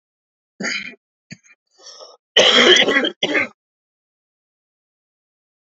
three_cough_length: 5.7 s
three_cough_amplitude: 30544
three_cough_signal_mean_std_ratio: 0.34
survey_phase: beta (2021-08-13 to 2022-03-07)
age: 45-64
gender: Male
wearing_mask: 'No'
symptom_cough_any: true
symptom_shortness_of_breath: true
symptom_other: true
symptom_onset: 8 days
smoker_status: Never smoked
respiratory_condition_asthma: true
respiratory_condition_other: false
recruitment_source: Test and Trace
submission_delay: 2 days
covid_test_result: Negative
covid_test_method: ePCR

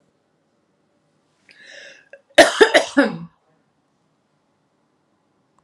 cough_length: 5.6 s
cough_amplitude: 32768
cough_signal_mean_std_ratio: 0.23
survey_phase: alpha (2021-03-01 to 2021-08-12)
age: 45-64
gender: Female
wearing_mask: 'Yes'
symptom_none: true
smoker_status: Ex-smoker
respiratory_condition_asthma: false
respiratory_condition_other: false
recruitment_source: Test and Trace
submission_delay: 0 days
covid_test_result: Negative
covid_test_method: LFT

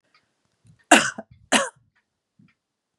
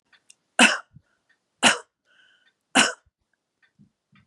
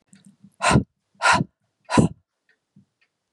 cough_length: 3.0 s
cough_amplitude: 32768
cough_signal_mean_std_ratio: 0.23
three_cough_length: 4.3 s
three_cough_amplitude: 31375
three_cough_signal_mean_std_ratio: 0.24
exhalation_length: 3.3 s
exhalation_amplitude: 23778
exhalation_signal_mean_std_ratio: 0.33
survey_phase: beta (2021-08-13 to 2022-03-07)
age: 45-64
gender: Female
wearing_mask: 'No'
symptom_none: true
smoker_status: Ex-smoker
respiratory_condition_asthma: false
respiratory_condition_other: false
recruitment_source: Test and Trace
submission_delay: 1 day
covid_test_result: Negative
covid_test_method: RT-qPCR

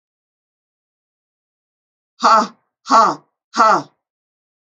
exhalation_length: 4.7 s
exhalation_amplitude: 30607
exhalation_signal_mean_std_ratio: 0.31
survey_phase: alpha (2021-03-01 to 2021-08-12)
age: 45-64
gender: Female
wearing_mask: 'No'
symptom_none: true
smoker_status: Ex-smoker
respiratory_condition_asthma: false
respiratory_condition_other: false
recruitment_source: REACT
submission_delay: 21 days
covid_test_result: Negative
covid_test_method: RT-qPCR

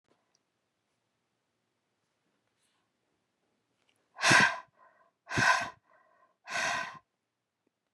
exhalation_length: 7.9 s
exhalation_amplitude: 12344
exhalation_signal_mean_std_ratio: 0.27
survey_phase: beta (2021-08-13 to 2022-03-07)
age: 45-64
gender: Female
wearing_mask: 'No'
symptom_none: true
symptom_onset: 3 days
smoker_status: Ex-smoker
respiratory_condition_asthma: false
respiratory_condition_other: false
recruitment_source: REACT
submission_delay: 2 days
covid_test_result: Negative
covid_test_method: RT-qPCR
influenza_a_test_result: Negative
influenza_b_test_result: Negative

